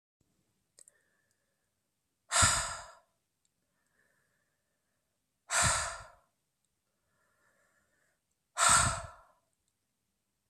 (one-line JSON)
{"exhalation_length": "10.5 s", "exhalation_amplitude": 9782, "exhalation_signal_mean_std_ratio": 0.27, "survey_phase": "beta (2021-08-13 to 2022-03-07)", "age": "18-44", "gender": "Female", "wearing_mask": "No", "symptom_cough_any": true, "symptom_shortness_of_breath": true, "symptom_fatigue": true, "symptom_change_to_sense_of_smell_or_taste": true, "symptom_loss_of_taste": true, "smoker_status": "Never smoked", "respiratory_condition_asthma": false, "respiratory_condition_other": false, "recruitment_source": "Test and Trace", "submission_delay": "2 days", "covid_test_result": "Positive", "covid_test_method": "RT-qPCR"}